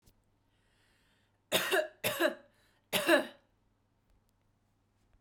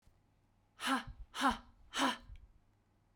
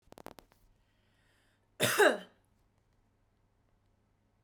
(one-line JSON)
{"three_cough_length": "5.2 s", "three_cough_amplitude": 7941, "three_cough_signal_mean_std_ratio": 0.33, "exhalation_length": "3.2 s", "exhalation_amplitude": 3325, "exhalation_signal_mean_std_ratio": 0.4, "cough_length": "4.4 s", "cough_amplitude": 8159, "cough_signal_mean_std_ratio": 0.22, "survey_phase": "beta (2021-08-13 to 2022-03-07)", "age": "18-44", "gender": "Female", "wearing_mask": "No", "symptom_none": true, "smoker_status": "Never smoked", "respiratory_condition_asthma": false, "respiratory_condition_other": false, "recruitment_source": "REACT", "submission_delay": "1 day", "covid_test_result": "Negative", "covid_test_method": "RT-qPCR", "influenza_a_test_result": "Negative", "influenza_b_test_result": "Negative"}